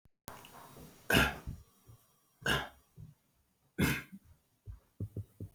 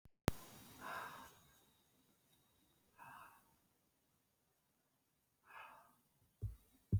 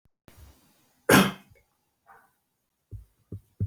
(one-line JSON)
{"three_cough_length": "5.5 s", "three_cough_amplitude": 8032, "three_cough_signal_mean_std_ratio": 0.35, "exhalation_length": "7.0 s", "exhalation_amplitude": 5612, "exhalation_signal_mean_std_ratio": 0.25, "cough_length": "3.7 s", "cough_amplitude": 21615, "cough_signal_mean_std_ratio": 0.23, "survey_phase": "beta (2021-08-13 to 2022-03-07)", "age": "45-64", "gender": "Male", "wearing_mask": "No", "symptom_runny_or_blocked_nose": true, "symptom_sore_throat": true, "symptom_onset": "12 days", "smoker_status": "Never smoked", "respiratory_condition_asthma": false, "respiratory_condition_other": false, "recruitment_source": "REACT", "submission_delay": "1 day", "covid_test_result": "Negative", "covid_test_method": "RT-qPCR", "influenza_a_test_result": "Negative", "influenza_b_test_result": "Negative"}